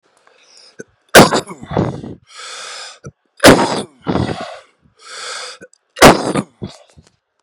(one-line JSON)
{"three_cough_length": "7.4 s", "three_cough_amplitude": 32768, "three_cough_signal_mean_std_ratio": 0.35, "survey_phase": "beta (2021-08-13 to 2022-03-07)", "age": "18-44", "gender": "Male", "wearing_mask": "No", "symptom_cough_any": true, "symptom_runny_or_blocked_nose": true, "symptom_diarrhoea": true, "symptom_fatigue": true, "symptom_onset": "3 days", "smoker_status": "Current smoker (e-cigarettes or vapes only)", "respiratory_condition_asthma": false, "respiratory_condition_other": false, "recruitment_source": "Test and Trace", "submission_delay": "1 day", "covid_test_result": "Positive", "covid_test_method": "RT-qPCR", "covid_ct_value": 15.1, "covid_ct_gene": "ORF1ab gene", "covid_ct_mean": 15.4, "covid_viral_load": "8900000 copies/ml", "covid_viral_load_category": "High viral load (>1M copies/ml)"}